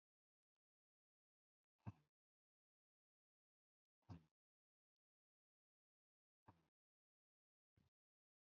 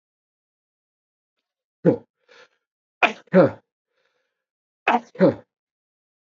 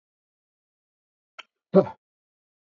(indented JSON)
{
  "exhalation_length": "8.5 s",
  "exhalation_amplitude": 274,
  "exhalation_signal_mean_std_ratio": 0.12,
  "three_cough_length": "6.3 s",
  "three_cough_amplitude": 29885,
  "three_cough_signal_mean_std_ratio": 0.24,
  "cough_length": "2.7 s",
  "cough_amplitude": 21729,
  "cough_signal_mean_std_ratio": 0.15,
  "survey_phase": "beta (2021-08-13 to 2022-03-07)",
  "age": "45-64",
  "gender": "Male",
  "wearing_mask": "No",
  "symptom_cough_any": true,
  "symptom_runny_or_blocked_nose": true,
  "symptom_fatigue": true,
  "symptom_onset": "3 days",
  "smoker_status": "Never smoked",
  "respiratory_condition_asthma": false,
  "respiratory_condition_other": false,
  "recruitment_source": "Test and Trace",
  "submission_delay": "2 days",
  "covid_test_result": "Positive",
  "covid_test_method": "RT-qPCR"
}